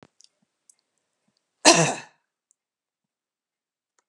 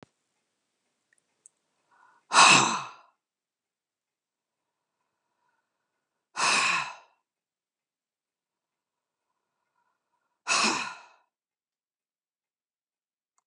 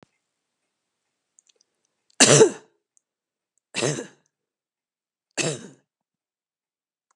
{"cough_length": "4.1 s", "cough_amplitude": 32427, "cough_signal_mean_std_ratio": 0.19, "exhalation_length": "13.5 s", "exhalation_amplitude": 21634, "exhalation_signal_mean_std_ratio": 0.23, "three_cough_length": "7.2 s", "three_cough_amplitude": 32680, "three_cough_signal_mean_std_ratio": 0.21, "survey_phase": "alpha (2021-03-01 to 2021-08-12)", "age": "65+", "gender": "Female", "wearing_mask": "No", "symptom_none": true, "smoker_status": "Ex-smoker", "respiratory_condition_asthma": false, "respiratory_condition_other": false, "recruitment_source": "REACT", "submission_delay": "1 day", "covid_test_result": "Negative", "covid_test_method": "RT-qPCR"}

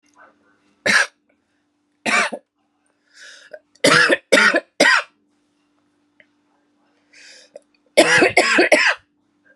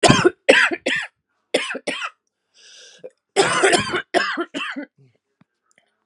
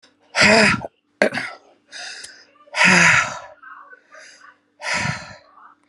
{"three_cough_length": "9.6 s", "three_cough_amplitude": 32767, "three_cough_signal_mean_std_ratio": 0.39, "cough_length": "6.1 s", "cough_amplitude": 32768, "cough_signal_mean_std_ratio": 0.44, "exhalation_length": "5.9 s", "exhalation_amplitude": 31693, "exhalation_signal_mean_std_ratio": 0.43, "survey_phase": "alpha (2021-03-01 to 2021-08-12)", "age": "45-64", "gender": "Female", "wearing_mask": "No", "symptom_cough_any": true, "symptom_new_continuous_cough": true, "symptom_shortness_of_breath": true, "symptom_abdominal_pain": true, "symptom_diarrhoea": true, "symptom_fatigue": true, "symptom_headache": true, "symptom_change_to_sense_of_smell_or_taste": true, "symptom_loss_of_taste": true, "smoker_status": "Current smoker (1 to 10 cigarettes per day)", "respiratory_condition_asthma": true, "respiratory_condition_other": false, "recruitment_source": "Test and Trace", "submission_delay": "1 day", "covid_test_result": "Positive", "covid_test_method": "LFT"}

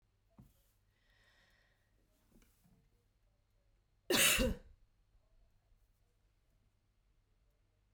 {"cough_length": "7.9 s", "cough_amplitude": 4812, "cough_signal_mean_std_ratio": 0.21, "survey_phase": "beta (2021-08-13 to 2022-03-07)", "age": "45-64", "gender": "Female", "wearing_mask": "No", "symptom_none": true, "smoker_status": "Ex-smoker", "respiratory_condition_asthma": false, "respiratory_condition_other": false, "recruitment_source": "REACT", "submission_delay": "2 days", "covid_test_result": "Negative", "covid_test_method": "RT-qPCR"}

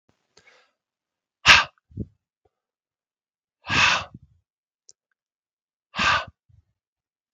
{"exhalation_length": "7.3 s", "exhalation_amplitude": 32768, "exhalation_signal_mean_std_ratio": 0.24, "survey_phase": "beta (2021-08-13 to 2022-03-07)", "age": "45-64", "gender": "Male", "wearing_mask": "No", "symptom_none": true, "smoker_status": "Never smoked", "respiratory_condition_asthma": false, "respiratory_condition_other": false, "recruitment_source": "REACT", "submission_delay": "1 day", "covid_test_result": "Negative", "covid_test_method": "RT-qPCR", "influenza_a_test_result": "Unknown/Void", "influenza_b_test_result": "Unknown/Void"}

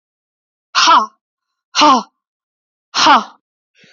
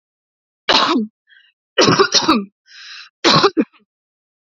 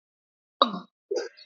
{"exhalation_length": "3.9 s", "exhalation_amplitude": 29885, "exhalation_signal_mean_std_ratio": 0.39, "three_cough_length": "4.4 s", "three_cough_amplitude": 32768, "three_cough_signal_mean_std_ratio": 0.45, "cough_length": "1.5 s", "cough_amplitude": 28260, "cough_signal_mean_std_ratio": 0.29, "survey_phase": "beta (2021-08-13 to 2022-03-07)", "age": "18-44", "gender": "Female", "wearing_mask": "No", "symptom_none": true, "smoker_status": "Never smoked", "respiratory_condition_asthma": false, "respiratory_condition_other": false, "recruitment_source": "REACT", "submission_delay": "2 days", "covid_test_result": "Negative", "covid_test_method": "RT-qPCR", "influenza_a_test_result": "Negative", "influenza_b_test_result": "Negative"}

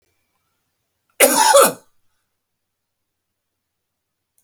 {"cough_length": "4.4 s", "cough_amplitude": 32768, "cough_signal_mean_std_ratio": 0.27, "survey_phase": "beta (2021-08-13 to 2022-03-07)", "age": "45-64", "gender": "Male", "wearing_mask": "No", "symptom_none": true, "smoker_status": "Never smoked", "respiratory_condition_asthma": false, "respiratory_condition_other": false, "recruitment_source": "REACT", "submission_delay": "1 day", "covid_test_result": "Negative", "covid_test_method": "RT-qPCR"}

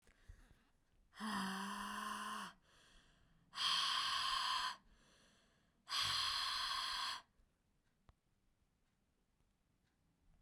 {"exhalation_length": "10.4 s", "exhalation_amplitude": 1643, "exhalation_signal_mean_std_ratio": 0.54, "survey_phase": "beta (2021-08-13 to 2022-03-07)", "age": "18-44", "gender": "Female", "wearing_mask": "No", "symptom_runny_or_blocked_nose": true, "smoker_status": "Never smoked", "respiratory_condition_asthma": false, "respiratory_condition_other": false, "recruitment_source": "Test and Trace", "submission_delay": "2 days", "covid_test_result": "Positive", "covid_test_method": "RT-qPCR", "covid_ct_value": 30.8, "covid_ct_gene": "ORF1ab gene", "covid_ct_mean": 31.7, "covid_viral_load": "39 copies/ml", "covid_viral_load_category": "Minimal viral load (< 10K copies/ml)"}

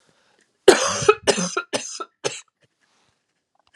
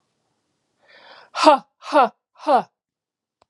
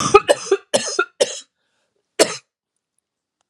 {"three_cough_length": "3.8 s", "three_cough_amplitude": 32768, "three_cough_signal_mean_std_ratio": 0.31, "exhalation_length": "3.5 s", "exhalation_amplitude": 31419, "exhalation_signal_mean_std_ratio": 0.3, "cough_length": "3.5 s", "cough_amplitude": 32768, "cough_signal_mean_std_ratio": 0.33, "survey_phase": "alpha (2021-03-01 to 2021-08-12)", "age": "45-64", "gender": "Female", "wearing_mask": "No", "symptom_cough_any": true, "symptom_fatigue": true, "symptom_headache": true, "symptom_onset": "5 days", "smoker_status": "Never smoked", "respiratory_condition_asthma": false, "respiratory_condition_other": false, "recruitment_source": "Test and Trace", "submission_delay": "2 days", "covid_test_result": "Positive", "covid_test_method": "RT-qPCR", "covid_ct_value": 31.1, "covid_ct_gene": "ORF1ab gene"}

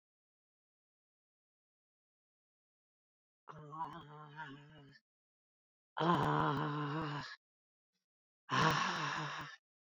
{"exhalation_length": "10.0 s", "exhalation_amplitude": 4303, "exhalation_signal_mean_std_ratio": 0.41, "survey_phase": "beta (2021-08-13 to 2022-03-07)", "age": "65+", "gender": "Female", "wearing_mask": "No", "symptom_cough_any": true, "symptom_runny_or_blocked_nose": true, "symptom_sore_throat": true, "symptom_fatigue": true, "symptom_headache": true, "symptom_loss_of_taste": true, "symptom_onset": "15 days", "smoker_status": "Never smoked", "respiratory_condition_asthma": false, "respiratory_condition_other": false, "recruitment_source": "Test and Trace", "submission_delay": "2 days", "covid_test_result": "Positive", "covid_test_method": "RT-qPCR", "covid_ct_value": 34.9, "covid_ct_gene": "ORF1ab gene"}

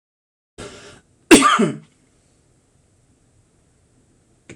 {"cough_length": "4.6 s", "cough_amplitude": 26028, "cough_signal_mean_std_ratio": 0.24, "survey_phase": "alpha (2021-03-01 to 2021-08-12)", "age": "65+", "gender": "Male", "wearing_mask": "No", "symptom_none": true, "smoker_status": "Ex-smoker", "respiratory_condition_asthma": false, "respiratory_condition_other": false, "recruitment_source": "REACT", "submission_delay": "1 day", "covid_test_result": "Negative", "covid_test_method": "RT-qPCR"}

